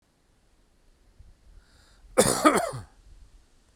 {"cough_length": "3.8 s", "cough_amplitude": 21693, "cough_signal_mean_std_ratio": 0.29, "survey_phase": "beta (2021-08-13 to 2022-03-07)", "age": "45-64", "gender": "Male", "wearing_mask": "No", "symptom_fatigue": true, "smoker_status": "Ex-smoker", "respiratory_condition_asthma": false, "respiratory_condition_other": false, "recruitment_source": "REACT", "submission_delay": "4 days", "covid_test_result": "Negative", "covid_test_method": "RT-qPCR"}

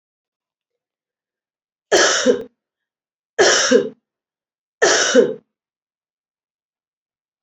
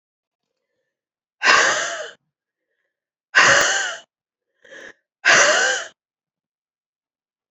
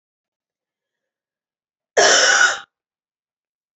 {"three_cough_length": "7.4 s", "three_cough_amplitude": 29074, "three_cough_signal_mean_std_ratio": 0.35, "exhalation_length": "7.5 s", "exhalation_amplitude": 30216, "exhalation_signal_mean_std_ratio": 0.38, "cough_length": "3.8 s", "cough_amplitude": 27238, "cough_signal_mean_std_ratio": 0.33, "survey_phase": "beta (2021-08-13 to 2022-03-07)", "age": "45-64", "gender": "Female", "wearing_mask": "No", "symptom_cough_any": true, "symptom_runny_or_blocked_nose": true, "symptom_sore_throat": true, "symptom_headache": true, "symptom_onset": "4 days", "smoker_status": "Ex-smoker", "respiratory_condition_asthma": false, "respiratory_condition_other": false, "recruitment_source": "Test and Trace", "submission_delay": "3 days", "covid_test_result": "Positive", "covid_test_method": "RT-qPCR", "covid_ct_value": 22.7, "covid_ct_gene": "ORF1ab gene", "covid_ct_mean": 23.7, "covid_viral_load": "17000 copies/ml", "covid_viral_load_category": "Low viral load (10K-1M copies/ml)"}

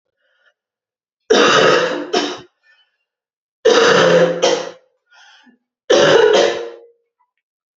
{"three_cough_length": "7.8 s", "three_cough_amplitude": 31606, "three_cough_signal_mean_std_ratio": 0.5, "survey_phase": "beta (2021-08-13 to 2022-03-07)", "age": "18-44", "gender": "Female", "wearing_mask": "No", "symptom_new_continuous_cough": true, "symptom_runny_or_blocked_nose": true, "symptom_sore_throat": true, "symptom_change_to_sense_of_smell_or_taste": true, "symptom_loss_of_taste": true, "symptom_other": true, "symptom_onset": "3 days", "smoker_status": "Never smoked", "respiratory_condition_asthma": false, "respiratory_condition_other": false, "recruitment_source": "Test and Trace", "submission_delay": "1 day", "covid_test_result": "Positive", "covid_test_method": "RT-qPCR", "covid_ct_value": 27.5, "covid_ct_gene": "N gene"}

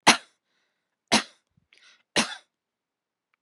{"three_cough_length": "3.4 s", "three_cough_amplitude": 27526, "three_cough_signal_mean_std_ratio": 0.21, "survey_phase": "beta (2021-08-13 to 2022-03-07)", "age": "65+", "gender": "Female", "wearing_mask": "No", "symptom_none": true, "smoker_status": "Ex-smoker", "respiratory_condition_asthma": false, "respiratory_condition_other": false, "recruitment_source": "REACT", "submission_delay": "2 days", "covid_test_result": "Negative", "covid_test_method": "RT-qPCR", "influenza_a_test_result": "Negative", "influenza_b_test_result": "Negative"}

